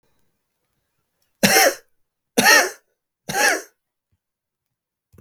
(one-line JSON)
{"three_cough_length": "5.2 s", "three_cough_amplitude": 32768, "three_cough_signal_mean_std_ratio": 0.32, "survey_phase": "beta (2021-08-13 to 2022-03-07)", "age": "18-44", "gender": "Male", "wearing_mask": "No", "symptom_cough_any": true, "symptom_shortness_of_breath": true, "symptom_fatigue": true, "symptom_change_to_sense_of_smell_or_taste": true, "symptom_onset": "3 days", "smoker_status": "Ex-smoker", "respiratory_condition_asthma": false, "respiratory_condition_other": false, "recruitment_source": "Test and Trace", "submission_delay": "2 days", "covid_test_result": "Positive", "covid_test_method": "RT-qPCR", "covid_ct_value": 20.3, "covid_ct_gene": "ORF1ab gene"}